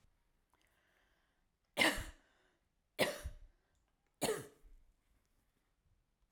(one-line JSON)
{"three_cough_length": "6.3 s", "three_cough_amplitude": 4498, "three_cough_signal_mean_std_ratio": 0.26, "survey_phase": "alpha (2021-03-01 to 2021-08-12)", "age": "65+", "gender": "Female", "wearing_mask": "No", "symptom_none": true, "smoker_status": "Ex-smoker", "respiratory_condition_asthma": false, "respiratory_condition_other": false, "recruitment_source": "REACT", "submission_delay": "2 days", "covid_test_result": "Negative", "covid_test_method": "RT-qPCR"}